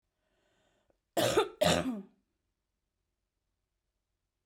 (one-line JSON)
{"cough_length": "4.5 s", "cough_amplitude": 6194, "cough_signal_mean_std_ratio": 0.3, "survey_phase": "beta (2021-08-13 to 2022-03-07)", "age": "45-64", "gender": "Female", "wearing_mask": "No", "symptom_cough_any": true, "symptom_runny_or_blocked_nose": true, "symptom_fatigue": true, "symptom_headache": true, "symptom_change_to_sense_of_smell_or_taste": true, "symptom_loss_of_taste": true, "symptom_other": true, "symptom_onset": "2 days", "smoker_status": "Never smoked", "respiratory_condition_asthma": false, "respiratory_condition_other": false, "recruitment_source": "Test and Trace", "submission_delay": "2 days", "covid_test_result": "Positive", "covid_test_method": "RT-qPCR"}